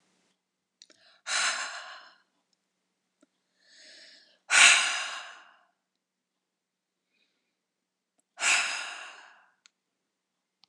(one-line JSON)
{"exhalation_length": "10.7 s", "exhalation_amplitude": 22302, "exhalation_signal_mean_std_ratio": 0.27, "survey_phase": "beta (2021-08-13 to 2022-03-07)", "age": "45-64", "gender": "Female", "wearing_mask": "No", "symptom_none": true, "smoker_status": "Never smoked", "respiratory_condition_asthma": false, "respiratory_condition_other": false, "recruitment_source": "REACT", "submission_delay": "1 day", "covid_test_result": "Negative", "covid_test_method": "RT-qPCR"}